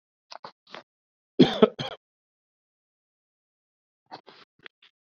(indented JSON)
{
  "cough_length": "5.1 s",
  "cough_amplitude": 26597,
  "cough_signal_mean_std_ratio": 0.16,
  "survey_phase": "beta (2021-08-13 to 2022-03-07)",
  "age": "18-44",
  "gender": "Male",
  "wearing_mask": "No",
  "symptom_sore_throat": true,
  "symptom_onset": "6 days",
  "smoker_status": "Never smoked",
  "respiratory_condition_asthma": false,
  "respiratory_condition_other": false,
  "recruitment_source": "REACT",
  "submission_delay": "2 days",
  "covid_test_result": "Negative",
  "covid_test_method": "RT-qPCR"
}